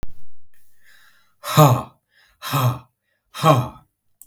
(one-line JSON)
{"exhalation_length": "4.3 s", "exhalation_amplitude": 32768, "exhalation_signal_mean_std_ratio": 0.44, "survey_phase": "beta (2021-08-13 to 2022-03-07)", "age": "45-64", "gender": "Male", "wearing_mask": "No", "symptom_runny_or_blocked_nose": true, "symptom_headache": true, "symptom_onset": "7 days", "smoker_status": "Never smoked", "respiratory_condition_asthma": false, "respiratory_condition_other": false, "recruitment_source": "Test and Trace", "submission_delay": "1 day", "covid_test_result": "Positive", "covid_test_method": "ePCR"}